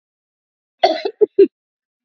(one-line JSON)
{"cough_length": "2.0 s", "cough_amplitude": 29349, "cough_signal_mean_std_ratio": 0.29, "survey_phase": "alpha (2021-03-01 to 2021-08-12)", "age": "45-64", "gender": "Female", "wearing_mask": "No", "symptom_fever_high_temperature": true, "symptom_loss_of_taste": true, "symptom_onset": "7 days", "smoker_status": "Never smoked", "respiratory_condition_asthma": false, "respiratory_condition_other": false, "recruitment_source": "Test and Trace", "submission_delay": "1 day", "covid_test_result": "Positive", "covid_test_method": "RT-qPCR", "covid_ct_value": 12.5, "covid_ct_gene": "ORF1ab gene", "covid_ct_mean": 12.9, "covid_viral_load": "58000000 copies/ml", "covid_viral_load_category": "High viral load (>1M copies/ml)"}